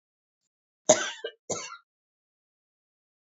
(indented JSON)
{
  "cough_length": "3.2 s",
  "cough_amplitude": 21522,
  "cough_signal_mean_std_ratio": 0.21,
  "survey_phase": "alpha (2021-03-01 to 2021-08-12)",
  "age": "65+",
  "gender": "Female",
  "wearing_mask": "No",
  "symptom_none": true,
  "smoker_status": "Ex-smoker",
  "respiratory_condition_asthma": false,
  "respiratory_condition_other": false,
  "recruitment_source": "REACT",
  "submission_delay": "2 days",
  "covid_test_result": "Negative",
  "covid_test_method": "RT-qPCR"
}